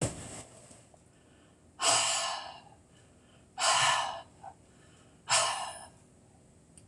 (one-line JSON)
{"exhalation_length": "6.9 s", "exhalation_amplitude": 7465, "exhalation_signal_mean_std_ratio": 0.46, "survey_phase": "beta (2021-08-13 to 2022-03-07)", "age": "65+", "gender": "Female", "wearing_mask": "No", "symptom_cough_any": true, "smoker_status": "Never smoked", "respiratory_condition_asthma": false, "respiratory_condition_other": false, "recruitment_source": "REACT", "submission_delay": "3 days", "covid_test_result": "Negative", "covid_test_method": "RT-qPCR", "influenza_a_test_result": "Negative", "influenza_b_test_result": "Negative"}